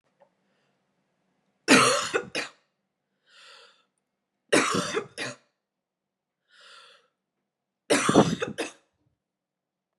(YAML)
three_cough_length: 10.0 s
three_cough_amplitude: 24295
three_cough_signal_mean_std_ratio: 0.3
survey_phase: beta (2021-08-13 to 2022-03-07)
age: 18-44
gender: Female
wearing_mask: 'No'
symptom_cough_any: true
symptom_runny_or_blocked_nose: true
symptom_headache: true
symptom_onset: 2 days
smoker_status: Never smoked
respiratory_condition_asthma: false
respiratory_condition_other: false
recruitment_source: Test and Trace
submission_delay: 1 day
covid_test_result: Positive
covid_test_method: RT-qPCR
covid_ct_value: 17.1
covid_ct_gene: N gene